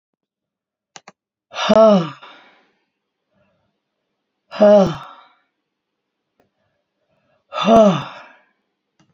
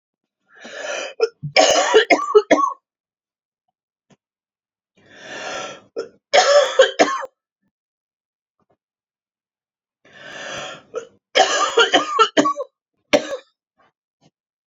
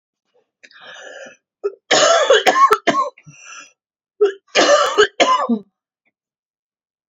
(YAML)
exhalation_length: 9.1 s
exhalation_amplitude: 28820
exhalation_signal_mean_std_ratio: 0.3
three_cough_length: 14.7 s
three_cough_amplitude: 30393
three_cough_signal_mean_std_ratio: 0.38
cough_length: 7.1 s
cough_amplitude: 30792
cough_signal_mean_std_ratio: 0.46
survey_phase: beta (2021-08-13 to 2022-03-07)
age: 45-64
gender: Female
wearing_mask: 'No'
symptom_cough_any: true
symptom_new_continuous_cough: true
symptom_runny_or_blocked_nose: true
symptom_shortness_of_breath: true
symptom_sore_throat: true
symptom_headache: true
symptom_change_to_sense_of_smell_or_taste: true
symptom_onset: 8 days
smoker_status: Ex-smoker
respiratory_condition_asthma: false
respiratory_condition_other: false
recruitment_source: Test and Trace
submission_delay: 1 day
covid_test_result: Negative
covid_test_method: RT-qPCR